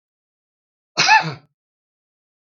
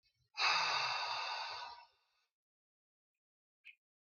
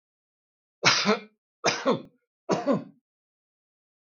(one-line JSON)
{"cough_length": "2.6 s", "cough_amplitude": 32690, "cough_signal_mean_std_ratio": 0.26, "exhalation_length": "4.1 s", "exhalation_amplitude": 3037, "exhalation_signal_mean_std_ratio": 0.46, "three_cough_length": "4.1 s", "three_cough_amplitude": 20325, "three_cough_signal_mean_std_ratio": 0.37, "survey_phase": "beta (2021-08-13 to 2022-03-07)", "age": "65+", "gender": "Male", "wearing_mask": "No", "symptom_none": true, "smoker_status": "Never smoked", "respiratory_condition_asthma": false, "respiratory_condition_other": false, "recruitment_source": "REACT", "submission_delay": "1 day", "covid_test_result": "Negative", "covid_test_method": "RT-qPCR", "influenza_a_test_result": "Negative", "influenza_b_test_result": "Negative"}